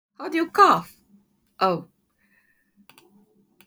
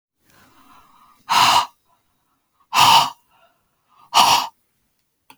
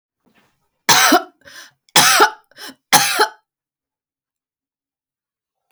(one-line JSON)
{"cough_length": "3.7 s", "cough_amplitude": 22133, "cough_signal_mean_std_ratio": 0.31, "exhalation_length": "5.4 s", "exhalation_amplitude": 32768, "exhalation_signal_mean_std_ratio": 0.36, "three_cough_length": "5.7 s", "three_cough_amplitude": 32768, "three_cough_signal_mean_std_ratio": 0.34, "survey_phase": "beta (2021-08-13 to 2022-03-07)", "age": "45-64", "gender": "Female", "wearing_mask": "No", "symptom_none": true, "smoker_status": "Never smoked", "respiratory_condition_asthma": false, "respiratory_condition_other": false, "recruitment_source": "REACT", "submission_delay": "1 day", "covid_test_result": "Negative", "covid_test_method": "RT-qPCR"}